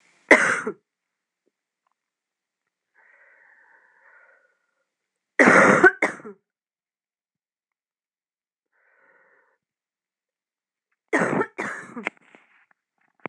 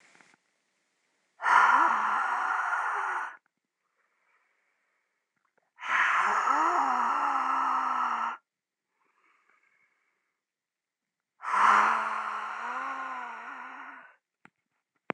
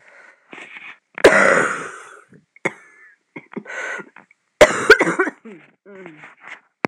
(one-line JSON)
{"three_cough_length": "13.3 s", "three_cough_amplitude": 26028, "three_cough_signal_mean_std_ratio": 0.24, "exhalation_length": "15.1 s", "exhalation_amplitude": 12787, "exhalation_signal_mean_std_ratio": 0.53, "cough_length": "6.9 s", "cough_amplitude": 26028, "cough_signal_mean_std_ratio": 0.34, "survey_phase": "beta (2021-08-13 to 2022-03-07)", "age": "18-44", "gender": "Female", "wearing_mask": "No", "symptom_cough_any": true, "symptom_shortness_of_breath": true, "symptom_diarrhoea": true, "symptom_fatigue": true, "symptom_headache": true, "symptom_change_to_sense_of_smell_or_taste": true, "symptom_loss_of_taste": true, "symptom_other": true, "symptom_onset": "7 days", "smoker_status": "Never smoked", "respiratory_condition_asthma": false, "respiratory_condition_other": false, "recruitment_source": "Test and Trace", "submission_delay": "1 day", "covid_test_result": "Positive", "covid_test_method": "RT-qPCR", "covid_ct_value": 17.1, "covid_ct_gene": "ORF1ab gene", "covid_ct_mean": 17.5, "covid_viral_load": "1900000 copies/ml", "covid_viral_load_category": "High viral load (>1M copies/ml)"}